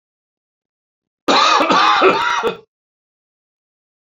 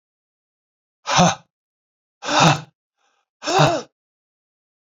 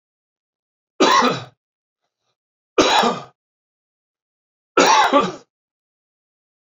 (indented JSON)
{
  "cough_length": "4.2 s",
  "cough_amplitude": 28079,
  "cough_signal_mean_std_ratio": 0.46,
  "exhalation_length": "4.9 s",
  "exhalation_amplitude": 30573,
  "exhalation_signal_mean_std_ratio": 0.34,
  "three_cough_length": "6.7 s",
  "three_cough_amplitude": 32767,
  "three_cough_signal_mean_std_ratio": 0.36,
  "survey_phase": "beta (2021-08-13 to 2022-03-07)",
  "age": "45-64",
  "gender": "Male",
  "wearing_mask": "No",
  "symptom_cough_any": true,
  "symptom_shortness_of_breath": true,
  "symptom_sore_throat": true,
  "symptom_fatigue": true,
  "symptom_headache": true,
  "symptom_change_to_sense_of_smell_or_taste": true,
  "symptom_onset": "3 days",
  "smoker_status": "Never smoked",
  "respiratory_condition_asthma": false,
  "respiratory_condition_other": false,
  "recruitment_source": "Test and Trace",
  "submission_delay": "2 days",
  "covid_test_result": "Positive",
  "covid_test_method": "RT-qPCR",
  "covid_ct_value": 22.7,
  "covid_ct_gene": "ORF1ab gene",
  "covid_ct_mean": 22.9,
  "covid_viral_load": "30000 copies/ml",
  "covid_viral_load_category": "Low viral load (10K-1M copies/ml)"
}